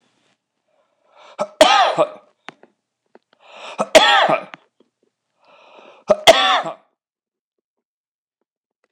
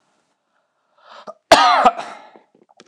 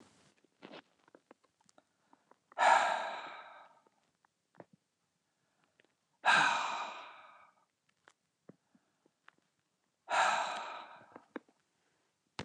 {"three_cough_length": "8.9 s", "three_cough_amplitude": 29204, "three_cough_signal_mean_std_ratio": 0.31, "cough_length": "2.9 s", "cough_amplitude": 29204, "cough_signal_mean_std_ratio": 0.32, "exhalation_length": "12.4 s", "exhalation_amplitude": 6791, "exhalation_signal_mean_std_ratio": 0.31, "survey_phase": "beta (2021-08-13 to 2022-03-07)", "age": "65+", "gender": "Male", "wearing_mask": "No", "symptom_headache": true, "smoker_status": "Never smoked", "respiratory_condition_asthma": false, "respiratory_condition_other": false, "recruitment_source": "REACT", "submission_delay": "1 day", "covid_test_result": "Negative", "covid_test_method": "RT-qPCR"}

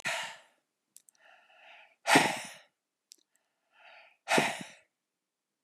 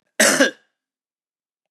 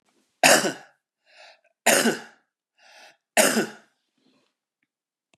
{"exhalation_length": "5.6 s", "exhalation_amplitude": 12699, "exhalation_signal_mean_std_ratio": 0.29, "cough_length": "1.7 s", "cough_amplitude": 29823, "cough_signal_mean_std_ratio": 0.33, "three_cough_length": "5.4 s", "three_cough_amplitude": 29909, "three_cough_signal_mean_std_ratio": 0.31, "survey_phase": "beta (2021-08-13 to 2022-03-07)", "age": "45-64", "gender": "Male", "wearing_mask": "No", "symptom_cough_any": true, "symptom_runny_or_blocked_nose": true, "symptom_fatigue": true, "symptom_headache": true, "symptom_onset": "5 days", "smoker_status": "Never smoked", "respiratory_condition_asthma": false, "respiratory_condition_other": false, "recruitment_source": "Test and Trace", "submission_delay": "2 days", "covid_test_result": "Positive", "covid_test_method": "RT-qPCR", "covid_ct_value": 24.4, "covid_ct_gene": "N gene"}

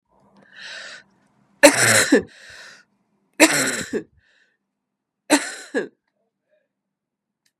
{"three_cough_length": "7.6 s", "three_cough_amplitude": 32768, "three_cough_signal_mean_std_ratio": 0.31, "survey_phase": "beta (2021-08-13 to 2022-03-07)", "age": "65+", "gender": "Female", "wearing_mask": "No", "symptom_none": true, "smoker_status": "Ex-smoker", "respiratory_condition_asthma": false, "respiratory_condition_other": false, "recruitment_source": "REACT", "submission_delay": "2 days", "covid_test_result": "Negative", "covid_test_method": "RT-qPCR", "influenza_a_test_result": "Negative", "influenza_b_test_result": "Negative"}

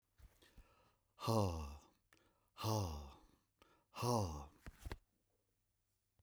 {"exhalation_length": "6.2 s", "exhalation_amplitude": 2191, "exhalation_signal_mean_std_ratio": 0.41, "survey_phase": "beta (2021-08-13 to 2022-03-07)", "age": "65+", "gender": "Male", "wearing_mask": "No", "symptom_none": true, "smoker_status": "Never smoked", "respiratory_condition_asthma": false, "respiratory_condition_other": false, "recruitment_source": "REACT", "submission_delay": "3 days", "covid_test_result": "Negative", "covid_test_method": "RT-qPCR", "influenza_a_test_result": "Negative", "influenza_b_test_result": "Negative"}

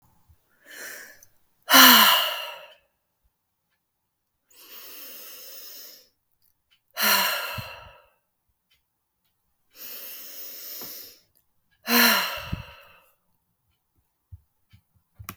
{"exhalation_length": "15.4 s", "exhalation_amplitude": 32766, "exhalation_signal_mean_std_ratio": 0.28, "survey_phase": "beta (2021-08-13 to 2022-03-07)", "age": "65+", "gender": "Female", "wearing_mask": "No", "symptom_none": true, "smoker_status": "Never smoked", "respiratory_condition_asthma": false, "respiratory_condition_other": false, "recruitment_source": "REACT", "submission_delay": "1 day", "covid_test_result": "Negative", "covid_test_method": "RT-qPCR"}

